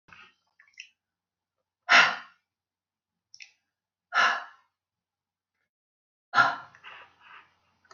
{"exhalation_length": "7.9 s", "exhalation_amplitude": 15257, "exhalation_signal_mean_std_ratio": 0.23, "survey_phase": "beta (2021-08-13 to 2022-03-07)", "age": "45-64", "gender": "Female", "wearing_mask": "No", "symptom_none": true, "smoker_status": "Never smoked", "respiratory_condition_asthma": false, "respiratory_condition_other": false, "recruitment_source": "REACT", "submission_delay": "1 day", "covid_test_result": "Negative", "covid_test_method": "RT-qPCR"}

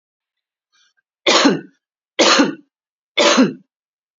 {"three_cough_length": "4.2 s", "three_cough_amplitude": 29843, "three_cough_signal_mean_std_ratio": 0.4, "survey_phase": "beta (2021-08-13 to 2022-03-07)", "age": "45-64", "gender": "Female", "wearing_mask": "No", "symptom_none": true, "smoker_status": "Never smoked", "respiratory_condition_asthma": false, "respiratory_condition_other": false, "recruitment_source": "Test and Trace", "submission_delay": "1 day", "covid_test_result": "Negative", "covid_test_method": "RT-qPCR"}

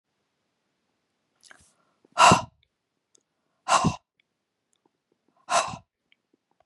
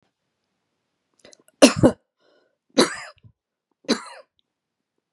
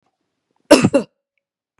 {"exhalation_length": "6.7 s", "exhalation_amplitude": 21537, "exhalation_signal_mean_std_ratio": 0.23, "three_cough_length": "5.1 s", "three_cough_amplitude": 32768, "three_cough_signal_mean_std_ratio": 0.21, "cough_length": "1.8 s", "cough_amplitude": 32768, "cough_signal_mean_std_ratio": 0.27, "survey_phase": "beta (2021-08-13 to 2022-03-07)", "age": "45-64", "gender": "Female", "wearing_mask": "No", "symptom_none": true, "smoker_status": "Ex-smoker", "respiratory_condition_asthma": false, "respiratory_condition_other": false, "recruitment_source": "REACT", "submission_delay": "1 day", "covid_test_result": "Negative", "covid_test_method": "RT-qPCR", "influenza_a_test_result": "Unknown/Void", "influenza_b_test_result": "Unknown/Void"}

